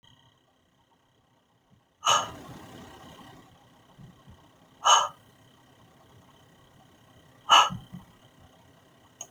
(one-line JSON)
{"exhalation_length": "9.3 s", "exhalation_amplitude": 18288, "exhalation_signal_mean_std_ratio": 0.24, "survey_phase": "beta (2021-08-13 to 2022-03-07)", "age": "45-64", "gender": "Female", "wearing_mask": "No", "symptom_none": true, "smoker_status": "Ex-smoker", "respiratory_condition_asthma": false, "respiratory_condition_other": false, "recruitment_source": "Test and Trace", "submission_delay": "2 days", "covid_test_result": "Negative", "covid_test_method": "RT-qPCR"}